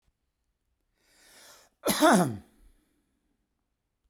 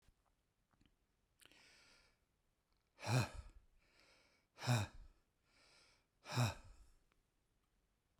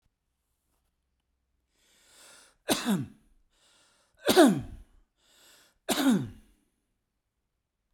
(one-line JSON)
{"cough_length": "4.1 s", "cough_amplitude": 11572, "cough_signal_mean_std_ratio": 0.27, "exhalation_length": "8.2 s", "exhalation_amplitude": 1856, "exhalation_signal_mean_std_ratio": 0.28, "three_cough_length": "7.9 s", "three_cough_amplitude": 17446, "three_cough_signal_mean_std_ratio": 0.28, "survey_phase": "beta (2021-08-13 to 2022-03-07)", "age": "45-64", "gender": "Male", "wearing_mask": "No", "symptom_none": true, "smoker_status": "Ex-smoker", "respiratory_condition_asthma": false, "respiratory_condition_other": false, "recruitment_source": "REACT", "submission_delay": "1 day", "covid_test_result": "Negative", "covid_test_method": "RT-qPCR"}